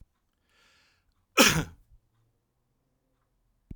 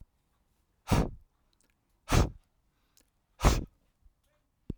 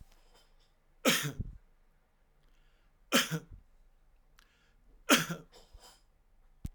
{"cough_length": "3.8 s", "cough_amplitude": 18779, "cough_signal_mean_std_ratio": 0.2, "exhalation_length": "4.8 s", "exhalation_amplitude": 17973, "exhalation_signal_mean_std_ratio": 0.28, "three_cough_length": "6.7 s", "three_cough_amplitude": 10705, "three_cough_signal_mean_std_ratio": 0.29, "survey_phase": "alpha (2021-03-01 to 2021-08-12)", "age": "65+", "gender": "Male", "wearing_mask": "No", "symptom_none": true, "smoker_status": "Never smoked", "respiratory_condition_asthma": false, "respiratory_condition_other": true, "recruitment_source": "REACT", "submission_delay": "2 days", "covid_test_result": "Negative", "covid_test_method": "RT-qPCR"}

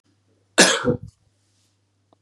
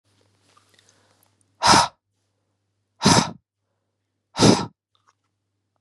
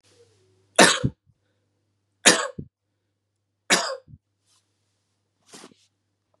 {"cough_length": "2.2 s", "cough_amplitude": 32767, "cough_signal_mean_std_ratio": 0.29, "exhalation_length": "5.8 s", "exhalation_amplitude": 29483, "exhalation_signal_mean_std_ratio": 0.27, "three_cough_length": "6.4 s", "three_cough_amplitude": 32767, "three_cough_signal_mean_std_ratio": 0.23, "survey_phase": "beta (2021-08-13 to 2022-03-07)", "age": "18-44", "gender": "Male", "wearing_mask": "No", "symptom_none": true, "smoker_status": "Never smoked", "respiratory_condition_asthma": false, "respiratory_condition_other": false, "recruitment_source": "REACT", "submission_delay": "4 days", "covid_test_result": "Negative", "covid_test_method": "RT-qPCR", "influenza_a_test_result": "Negative", "influenza_b_test_result": "Negative"}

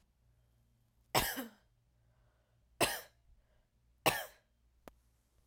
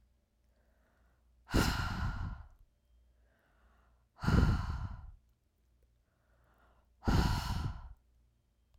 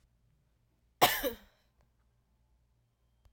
{"three_cough_length": "5.5 s", "three_cough_amplitude": 9318, "three_cough_signal_mean_std_ratio": 0.26, "exhalation_length": "8.8 s", "exhalation_amplitude": 7757, "exhalation_signal_mean_std_ratio": 0.4, "cough_length": "3.3 s", "cough_amplitude": 11962, "cough_signal_mean_std_ratio": 0.21, "survey_phase": "beta (2021-08-13 to 2022-03-07)", "age": "18-44", "gender": "Female", "wearing_mask": "No", "symptom_cough_any": true, "symptom_runny_or_blocked_nose": true, "symptom_abdominal_pain": true, "symptom_diarrhoea": true, "symptom_fatigue": true, "symptom_fever_high_temperature": true, "symptom_headache": true, "symptom_other": true, "symptom_onset": "3 days", "smoker_status": "Never smoked", "respiratory_condition_asthma": false, "respiratory_condition_other": false, "recruitment_source": "Test and Trace", "submission_delay": "2 days", "covid_test_result": "Positive", "covid_test_method": "RT-qPCR", "covid_ct_value": 15.3, "covid_ct_gene": "ORF1ab gene", "covid_ct_mean": 15.6, "covid_viral_load": "7500000 copies/ml", "covid_viral_load_category": "High viral load (>1M copies/ml)"}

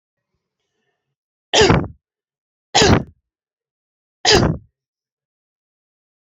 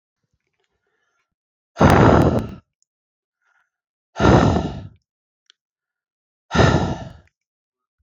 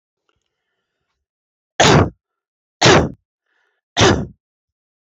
{"three_cough_length": "6.2 s", "three_cough_amplitude": 32767, "three_cough_signal_mean_std_ratio": 0.3, "exhalation_length": "8.0 s", "exhalation_amplitude": 27810, "exhalation_signal_mean_std_ratio": 0.35, "cough_length": "5.0 s", "cough_amplitude": 31828, "cough_signal_mean_std_ratio": 0.32, "survey_phase": "beta (2021-08-13 to 2022-03-07)", "age": "45-64", "gender": "Female", "wearing_mask": "No", "symptom_none": true, "smoker_status": "Ex-smoker", "respiratory_condition_asthma": false, "respiratory_condition_other": false, "recruitment_source": "REACT", "submission_delay": "1 day", "covid_test_result": "Negative", "covid_test_method": "RT-qPCR"}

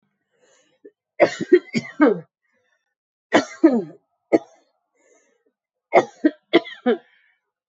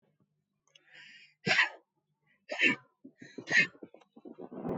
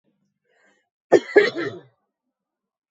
{"three_cough_length": "7.7 s", "three_cough_amplitude": 29321, "three_cough_signal_mean_std_ratio": 0.3, "exhalation_length": "4.8 s", "exhalation_amplitude": 8139, "exhalation_signal_mean_std_ratio": 0.34, "cough_length": "2.9 s", "cough_amplitude": 28392, "cough_signal_mean_std_ratio": 0.25, "survey_phase": "beta (2021-08-13 to 2022-03-07)", "age": "45-64", "gender": "Female", "wearing_mask": "No", "symptom_cough_any": true, "symptom_runny_or_blocked_nose": true, "symptom_headache": true, "symptom_onset": "5 days", "smoker_status": "Never smoked", "respiratory_condition_asthma": false, "respiratory_condition_other": false, "recruitment_source": "Test and Trace", "submission_delay": "1 day", "covid_test_result": "Positive", "covid_test_method": "RT-qPCR", "covid_ct_value": 15.1, "covid_ct_gene": "ORF1ab gene", "covid_ct_mean": 15.3, "covid_viral_load": "9500000 copies/ml", "covid_viral_load_category": "High viral load (>1M copies/ml)"}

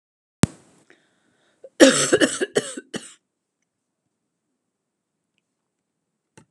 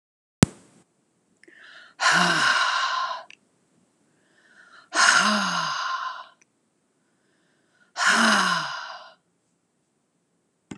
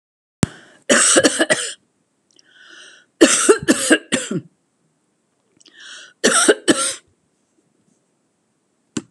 {"cough_length": "6.5 s", "cough_amplitude": 32768, "cough_signal_mean_std_ratio": 0.22, "exhalation_length": "10.8 s", "exhalation_amplitude": 32767, "exhalation_signal_mean_std_ratio": 0.44, "three_cough_length": "9.1 s", "three_cough_amplitude": 32768, "three_cough_signal_mean_std_ratio": 0.37, "survey_phase": "alpha (2021-03-01 to 2021-08-12)", "age": "65+", "gender": "Female", "wearing_mask": "No", "symptom_none": true, "smoker_status": "Never smoked", "respiratory_condition_asthma": false, "respiratory_condition_other": false, "recruitment_source": "REACT", "submission_delay": "2 days", "covid_test_result": "Negative", "covid_test_method": "RT-qPCR"}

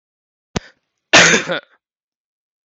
{"cough_length": "2.6 s", "cough_amplitude": 31847, "cough_signal_mean_std_ratio": 0.3, "survey_phase": "beta (2021-08-13 to 2022-03-07)", "age": "18-44", "gender": "Female", "wearing_mask": "No", "symptom_sore_throat": true, "symptom_fatigue": true, "smoker_status": "Never smoked", "respiratory_condition_asthma": false, "respiratory_condition_other": false, "recruitment_source": "Test and Trace", "submission_delay": "2 days", "covid_test_result": "Positive", "covid_test_method": "RT-qPCR", "covid_ct_value": 27.7, "covid_ct_gene": "N gene"}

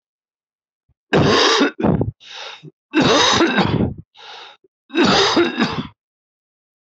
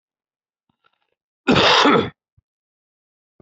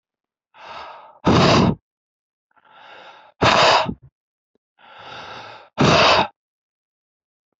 {"three_cough_length": "6.9 s", "three_cough_amplitude": 26469, "three_cough_signal_mean_std_ratio": 0.56, "cough_length": "3.4 s", "cough_amplitude": 28636, "cough_signal_mean_std_ratio": 0.34, "exhalation_length": "7.6 s", "exhalation_amplitude": 25890, "exhalation_signal_mean_std_ratio": 0.39, "survey_phase": "beta (2021-08-13 to 2022-03-07)", "age": "45-64", "gender": "Male", "wearing_mask": "No", "symptom_cough_any": true, "symptom_new_continuous_cough": true, "symptom_runny_or_blocked_nose": true, "symptom_sore_throat": true, "symptom_change_to_sense_of_smell_or_taste": true, "symptom_loss_of_taste": true, "symptom_onset": "11 days", "smoker_status": "Current smoker (e-cigarettes or vapes only)", "respiratory_condition_asthma": false, "respiratory_condition_other": false, "recruitment_source": "REACT", "submission_delay": "2 days", "covid_test_result": "Negative", "covid_test_method": "RT-qPCR"}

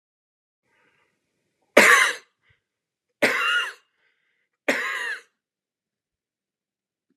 {"three_cough_length": "7.2 s", "three_cough_amplitude": 32768, "three_cough_signal_mean_std_ratio": 0.29, "survey_phase": "alpha (2021-03-01 to 2021-08-12)", "age": "45-64", "gender": "Male", "wearing_mask": "No", "symptom_none": true, "symptom_onset": "12 days", "smoker_status": "Never smoked", "respiratory_condition_asthma": false, "respiratory_condition_other": false, "recruitment_source": "REACT", "submission_delay": "1 day", "covid_test_result": "Negative", "covid_test_method": "RT-qPCR"}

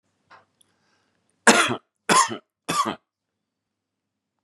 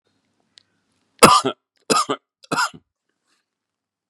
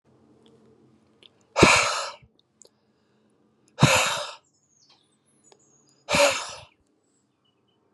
{"three_cough_length": "4.4 s", "three_cough_amplitude": 32767, "three_cough_signal_mean_std_ratio": 0.29, "cough_length": "4.1 s", "cough_amplitude": 32768, "cough_signal_mean_std_ratio": 0.27, "exhalation_length": "7.9 s", "exhalation_amplitude": 32616, "exhalation_signal_mean_std_ratio": 0.3, "survey_phase": "beta (2021-08-13 to 2022-03-07)", "age": "45-64", "gender": "Male", "wearing_mask": "No", "symptom_cough_any": true, "symptom_runny_or_blocked_nose": true, "smoker_status": "Never smoked", "respiratory_condition_asthma": false, "respiratory_condition_other": false, "recruitment_source": "Test and Trace", "submission_delay": "0 days", "covid_test_result": "Positive", "covid_test_method": "LFT"}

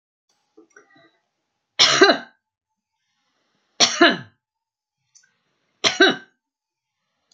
{"three_cough_length": "7.3 s", "three_cough_amplitude": 32768, "three_cough_signal_mean_std_ratio": 0.27, "survey_phase": "beta (2021-08-13 to 2022-03-07)", "age": "65+", "gender": "Female", "wearing_mask": "No", "symptom_none": true, "smoker_status": "Never smoked", "respiratory_condition_asthma": false, "respiratory_condition_other": false, "recruitment_source": "REACT", "submission_delay": "2 days", "covid_test_result": "Negative", "covid_test_method": "RT-qPCR"}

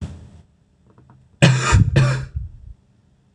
{"cough_length": "3.3 s", "cough_amplitude": 26028, "cough_signal_mean_std_ratio": 0.44, "survey_phase": "beta (2021-08-13 to 2022-03-07)", "age": "18-44", "gender": "Male", "wearing_mask": "No", "symptom_cough_any": true, "symptom_runny_or_blocked_nose": true, "symptom_sore_throat": true, "symptom_fatigue": true, "symptom_headache": true, "symptom_change_to_sense_of_smell_or_taste": true, "smoker_status": "Never smoked", "respiratory_condition_asthma": false, "respiratory_condition_other": false, "recruitment_source": "Test and Trace", "submission_delay": "2 days", "covid_test_result": "Positive", "covid_test_method": "LFT"}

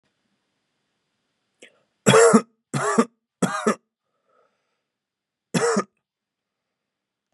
{"three_cough_length": "7.3 s", "three_cough_amplitude": 29649, "three_cough_signal_mean_std_ratio": 0.29, "survey_phase": "beta (2021-08-13 to 2022-03-07)", "age": "18-44", "gender": "Male", "wearing_mask": "No", "symptom_fatigue": true, "symptom_fever_high_temperature": true, "symptom_onset": "8 days", "smoker_status": "Never smoked", "respiratory_condition_asthma": false, "respiratory_condition_other": false, "recruitment_source": "Test and Trace", "submission_delay": "1 day", "covid_test_result": "Positive", "covid_test_method": "RT-qPCR", "covid_ct_value": 22.9, "covid_ct_gene": "N gene"}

